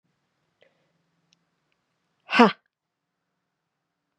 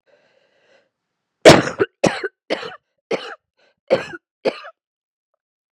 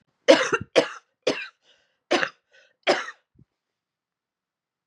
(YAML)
exhalation_length: 4.2 s
exhalation_amplitude: 31659
exhalation_signal_mean_std_ratio: 0.15
cough_length: 5.7 s
cough_amplitude: 32768
cough_signal_mean_std_ratio: 0.25
three_cough_length: 4.9 s
three_cough_amplitude: 28454
three_cough_signal_mean_std_ratio: 0.28
survey_phase: beta (2021-08-13 to 2022-03-07)
age: 18-44
gender: Female
wearing_mask: 'No'
symptom_cough_any: true
symptom_runny_or_blocked_nose: true
symptom_sore_throat: true
symptom_abdominal_pain: true
symptom_fatigue: true
symptom_fever_high_temperature: true
symptom_headache: true
symptom_change_to_sense_of_smell_or_taste: true
symptom_loss_of_taste: true
symptom_onset: 6 days
smoker_status: Never smoked
respiratory_condition_asthma: false
respiratory_condition_other: false
recruitment_source: Test and Trace
submission_delay: 2 days
covid_test_result: Positive
covid_test_method: RT-qPCR